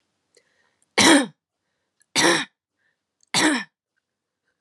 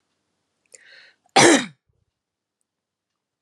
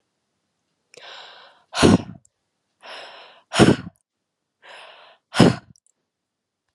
{"three_cough_length": "4.6 s", "three_cough_amplitude": 29831, "three_cough_signal_mean_std_ratio": 0.33, "cough_length": "3.4 s", "cough_amplitude": 32234, "cough_signal_mean_std_ratio": 0.23, "exhalation_length": "6.7 s", "exhalation_amplitude": 32767, "exhalation_signal_mean_std_ratio": 0.25, "survey_phase": "beta (2021-08-13 to 2022-03-07)", "age": "18-44", "gender": "Female", "wearing_mask": "No", "symptom_none": true, "symptom_onset": "7 days", "smoker_status": "Never smoked", "respiratory_condition_asthma": false, "respiratory_condition_other": false, "recruitment_source": "Test and Trace", "submission_delay": "2 days", "covid_test_result": "Positive", "covid_test_method": "ePCR"}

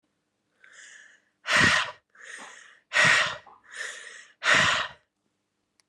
{"exhalation_length": "5.9 s", "exhalation_amplitude": 13738, "exhalation_signal_mean_std_ratio": 0.41, "survey_phase": "beta (2021-08-13 to 2022-03-07)", "age": "18-44", "gender": "Female", "wearing_mask": "No", "symptom_cough_any": true, "symptom_runny_or_blocked_nose": true, "symptom_shortness_of_breath": true, "symptom_sore_throat": true, "symptom_fatigue": true, "symptom_headache": true, "symptom_onset": "3 days", "smoker_status": "Current smoker (11 or more cigarettes per day)", "respiratory_condition_asthma": false, "respiratory_condition_other": false, "recruitment_source": "Test and Trace", "submission_delay": "1 day", "covid_test_result": "Positive", "covid_test_method": "RT-qPCR", "covid_ct_value": 22.3, "covid_ct_gene": "ORF1ab gene"}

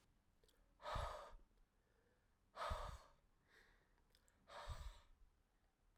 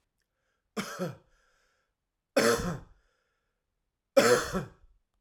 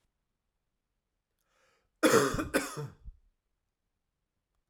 {"exhalation_length": "6.0 s", "exhalation_amplitude": 693, "exhalation_signal_mean_std_ratio": 0.43, "three_cough_length": "5.2 s", "three_cough_amplitude": 12052, "three_cough_signal_mean_std_ratio": 0.33, "cough_length": "4.7 s", "cough_amplitude": 8915, "cough_signal_mean_std_ratio": 0.27, "survey_phase": "alpha (2021-03-01 to 2021-08-12)", "age": "45-64", "gender": "Male", "wearing_mask": "No", "symptom_cough_any": true, "symptom_diarrhoea": true, "symptom_change_to_sense_of_smell_or_taste": true, "symptom_loss_of_taste": true, "symptom_onset": "3 days", "smoker_status": "Ex-smoker", "respiratory_condition_asthma": true, "respiratory_condition_other": false, "recruitment_source": "Test and Trace", "submission_delay": "2 days", "covid_test_result": "Positive", "covid_test_method": "RT-qPCR", "covid_ct_value": 12.9, "covid_ct_gene": "ORF1ab gene", "covid_ct_mean": 14.1, "covid_viral_load": "23000000 copies/ml", "covid_viral_load_category": "High viral load (>1M copies/ml)"}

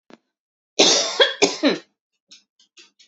{"cough_length": "3.1 s", "cough_amplitude": 31021, "cough_signal_mean_std_ratio": 0.38, "survey_phase": "beta (2021-08-13 to 2022-03-07)", "age": "18-44", "gender": "Female", "wearing_mask": "No", "symptom_cough_any": true, "symptom_runny_or_blocked_nose": true, "smoker_status": "Never smoked", "respiratory_condition_asthma": false, "respiratory_condition_other": false, "recruitment_source": "REACT", "submission_delay": "1 day", "covid_test_result": "Negative", "covid_test_method": "RT-qPCR", "influenza_a_test_result": "Negative", "influenza_b_test_result": "Negative"}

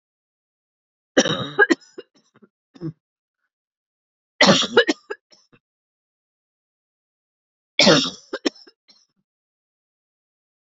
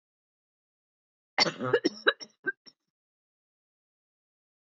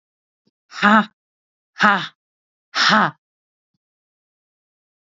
{"three_cough_length": "10.7 s", "three_cough_amplitude": 29235, "three_cough_signal_mean_std_ratio": 0.25, "cough_length": "4.7 s", "cough_amplitude": 13394, "cough_signal_mean_std_ratio": 0.23, "exhalation_length": "5.0 s", "exhalation_amplitude": 31447, "exhalation_signal_mean_std_ratio": 0.3, "survey_phase": "alpha (2021-03-01 to 2021-08-12)", "age": "45-64", "gender": "Female", "wearing_mask": "No", "symptom_none": true, "smoker_status": "Ex-smoker", "respiratory_condition_asthma": true, "respiratory_condition_other": false, "recruitment_source": "REACT", "submission_delay": "1 day", "covid_test_result": "Negative", "covid_test_method": "RT-qPCR"}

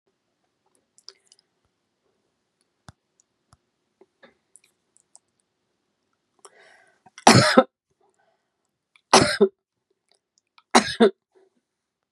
{"cough_length": "12.1 s", "cough_amplitude": 32768, "cough_signal_mean_std_ratio": 0.19, "survey_phase": "beta (2021-08-13 to 2022-03-07)", "age": "65+", "gender": "Female", "wearing_mask": "No", "symptom_none": true, "smoker_status": "Never smoked", "respiratory_condition_asthma": false, "respiratory_condition_other": false, "recruitment_source": "REACT", "submission_delay": "1 day", "covid_test_result": "Negative", "covid_test_method": "RT-qPCR", "influenza_a_test_result": "Negative", "influenza_b_test_result": "Negative"}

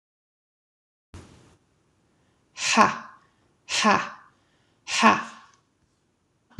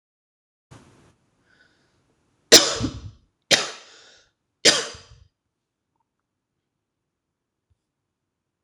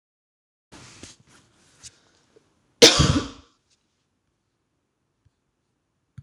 {"exhalation_length": "6.6 s", "exhalation_amplitude": 26027, "exhalation_signal_mean_std_ratio": 0.29, "three_cough_length": "8.6 s", "three_cough_amplitude": 26028, "three_cough_signal_mean_std_ratio": 0.19, "cough_length": "6.2 s", "cough_amplitude": 26028, "cough_signal_mean_std_ratio": 0.19, "survey_phase": "beta (2021-08-13 to 2022-03-07)", "age": "18-44", "gender": "Female", "wearing_mask": "No", "symptom_cough_any": true, "symptom_runny_or_blocked_nose": true, "symptom_sore_throat": true, "symptom_fatigue": true, "symptom_headache": true, "symptom_other": true, "symptom_onset": "3 days", "smoker_status": "Never smoked", "respiratory_condition_asthma": false, "respiratory_condition_other": false, "recruitment_source": "Test and Trace", "submission_delay": "2 days", "covid_test_result": "Positive", "covid_test_method": "ePCR"}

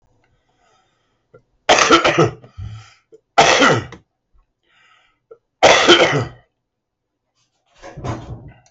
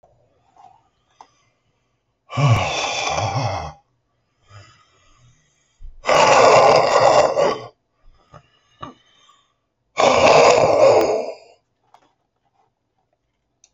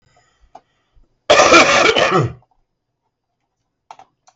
{"three_cough_length": "8.7 s", "three_cough_amplitude": 32768, "three_cough_signal_mean_std_ratio": 0.37, "exhalation_length": "13.7 s", "exhalation_amplitude": 31587, "exhalation_signal_mean_std_ratio": 0.44, "cough_length": "4.4 s", "cough_amplitude": 32768, "cough_signal_mean_std_ratio": 0.39, "survey_phase": "beta (2021-08-13 to 2022-03-07)", "age": "65+", "gender": "Male", "wearing_mask": "No", "symptom_cough_any": true, "smoker_status": "Current smoker (11 or more cigarettes per day)", "respiratory_condition_asthma": false, "respiratory_condition_other": true, "recruitment_source": "REACT", "submission_delay": "1 day", "covid_test_result": "Negative", "covid_test_method": "RT-qPCR"}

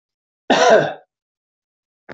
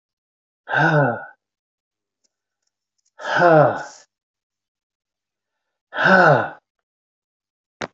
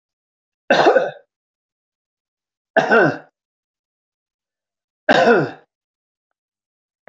{"cough_length": "2.1 s", "cough_amplitude": 24617, "cough_signal_mean_std_ratio": 0.36, "exhalation_length": "7.9 s", "exhalation_amplitude": 25432, "exhalation_signal_mean_std_ratio": 0.35, "three_cough_length": "7.1 s", "three_cough_amplitude": 24720, "three_cough_signal_mean_std_ratio": 0.31, "survey_phase": "beta (2021-08-13 to 2022-03-07)", "age": "65+", "gender": "Male", "wearing_mask": "No", "symptom_none": true, "smoker_status": "Ex-smoker", "respiratory_condition_asthma": false, "respiratory_condition_other": false, "recruitment_source": "REACT", "submission_delay": "3 days", "covid_test_result": "Negative", "covid_test_method": "RT-qPCR"}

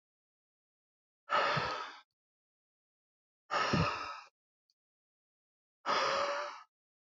{"exhalation_length": "7.1 s", "exhalation_amplitude": 4595, "exhalation_signal_mean_std_ratio": 0.42, "survey_phase": "beta (2021-08-13 to 2022-03-07)", "age": "18-44", "gender": "Male", "wearing_mask": "No", "symptom_cough_any": true, "symptom_sore_throat": true, "symptom_onset": "2 days", "smoker_status": "Never smoked", "respiratory_condition_asthma": false, "respiratory_condition_other": false, "recruitment_source": "Test and Trace", "submission_delay": "1 day", "covid_test_result": "Positive", "covid_test_method": "RT-qPCR", "covid_ct_value": 20.7, "covid_ct_gene": "ORF1ab gene", "covid_ct_mean": 21.0, "covid_viral_load": "130000 copies/ml", "covid_viral_load_category": "Low viral load (10K-1M copies/ml)"}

